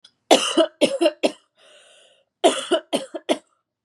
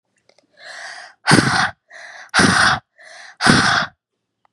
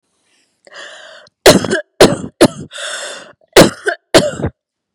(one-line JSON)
{"three_cough_length": "3.8 s", "three_cough_amplitude": 32767, "three_cough_signal_mean_std_ratio": 0.4, "exhalation_length": "4.5 s", "exhalation_amplitude": 32768, "exhalation_signal_mean_std_ratio": 0.47, "cough_length": "4.9 s", "cough_amplitude": 32768, "cough_signal_mean_std_ratio": 0.38, "survey_phase": "beta (2021-08-13 to 2022-03-07)", "age": "18-44", "gender": "Female", "wearing_mask": "No", "symptom_sore_throat": true, "symptom_onset": "3 days", "smoker_status": "Current smoker (e-cigarettes or vapes only)", "respiratory_condition_asthma": false, "respiratory_condition_other": false, "recruitment_source": "REACT", "submission_delay": "1 day", "covid_test_result": "Negative", "covid_test_method": "RT-qPCR", "influenza_a_test_result": "Negative", "influenza_b_test_result": "Negative"}